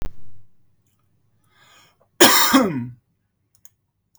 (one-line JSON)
{"cough_length": "4.2 s", "cough_amplitude": 32767, "cough_signal_mean_std_ratio": 0.35, "survey_phase": "beta (2021-08-13 to 2022-03-07)", "age": "18-44", "gender": "Male", "wearing_mask": "No", "symptom_none": true, "smoker_status": "Never smoked", "respiratory_condition_asthma": false, "respiratory_condition_other": false, "recruitment_source": "REACT", "submission_delay": "1 day", "covid_test_result": "Negative", "covid_test_method": "RT-qPCR", "influenza_a_test_result": "Negative", "influenza_b_test_result": "Negative"}